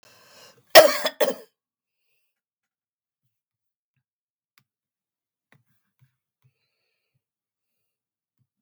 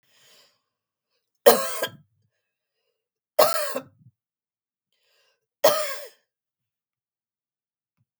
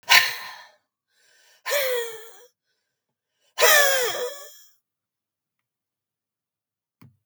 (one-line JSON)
{"cough_length": "8.6 s", "cough_amplitude": 32768, "cough_signal_mean_std_ratio": 0.14, "three_cough_length": "8.2 s", "three_cough_amplitude": 32768, "three_cough_signal_mean_std_ratio": 0.23, "exhalation_length": "7.3 s", "exhalation_amplitude": 32768, "exhalation_signal_mean_std_ratio": 0.33, "survey_phase": "beta (2021-08-13 to 2022-03-07)", "age": "45-64", "gender": "Female", "wearing_mask": "No", "symptom_none": true, "smoker_status": "Never smoked", "respiratory_condition_asthma": true, "respiratory_condition_other": false, "recruitment_source": "REACT", "submission_delay": "2 days", "covid_test_result": "Negative", "covid_test_method": "RT-qPCR", "influenza_a_test_result": "Negative", "influenza_b_test_result": "Negative"}